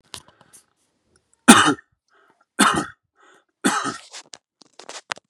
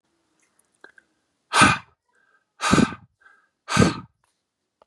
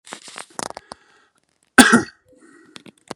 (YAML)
three_cough_length: 5.3 s
three_cough_amplitude: 32768
three_cough_signal_mean_std_ratio: 0.27
exhalation_length: 4.9 s
exhalation_amplitude: 27919
exhalation_signal_mean_std_ratio: 0.3
cough_length: 3.2 s
cough_amplitude: 32768
cough_signal_mean_std_ratio: 0.23
survey_phase: beta (2021-08-13 to 2022-03-07)
age: 18-44
gender: Male
wearing_mask: 'No'
symptom_sore_throat: true
smoker_status: Never smoked
respiratory_condition_asthma: false
respiratory_condition_other: false
recruitment_source: Test and Trace
submission_delay: 2 days
covid_test_result: Positive
covid_test_method: LFT